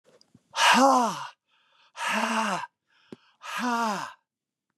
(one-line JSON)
{"exhalation_length": "4.8 s", "exhalation_amplitude": 13038, "exhalation_signal_mean_std_ratio": 0.48, "survey_phase": "beta (2021-08-13 to 2022-03-07)", "age": "65+", "gender": "Male", "wearing_mask": "No", "symptom_none": true, "smoker_status": "Never smoked", "respiratory_condition_asthma": false, "respiratory_condition_other": false, "recruitment_source": "REACT", "submission_delay": "4 days", "covid_test_result": "Negative", "covid_test_method": "RT-qPCR", "influenza_a_test_result": "Negative", "influenza_b_test_result": "Negative"}